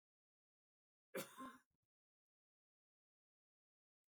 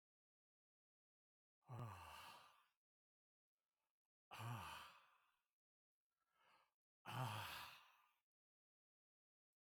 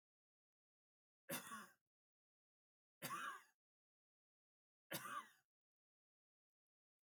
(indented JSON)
{
  "cough_length": "4.1 s",
  "cough_amplitude": 513,
  "cough_signal_mean_std_ratio": 0.21,
  "exhalation_length": "9.6 s",
  "exhalation_amplitude": 467,
  "exhalation_signal_mean_std_ratio": 0.37,
  "three_cough_length": "7.1 s",
  "three_cough_amplitude": 768,
  "three_cough_signal_mean_std_ratio": 0.3,
  "survey_phase": "beta (2021-08-13 to 2022-03-07)",
  "age": "65+",
  "gender": "Male",
  "wearing_mask": "No",
  "symptom_none": true,
  "smoker_status": "Ex-smoker",
  "respiratory_condition_asthma": false,
  "respiratory_condition_other": true,
  "recruitment_source": "REACT",
  "submission_delay": "2 days",
  "covid_test_result": "Negative",
  "covid_test_method": "RT-qPCR",
  "influenza_a_test_result": "Negative",
  "influenza_b_test_result": "Negative"
}